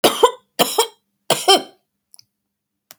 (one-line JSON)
{"cough_length": "3.0 s", "cough_amplitude": 32768, "cough_signal_mean_std_ratio": 0.34, "survey_phase": "beta (2021-08-13 to 2022-03-07)", "age": "65+", "gender": "Female", "wearing_mask": "No", "symptom_cough_any": true, "symptom_runny_or_blocked_nose": true, "smoker_status": "Never smoked", "respiratory_condition_asthma": false, "respiratory_condition_other": false, "recruitment_source": "REACT", "submission_delay": "1 day", "covid_test_result": "Negative", "covid_test_method": "RT-qPCR", "influenza_a_test_result": "Negative", "influenza_b_test_result": "Negative"}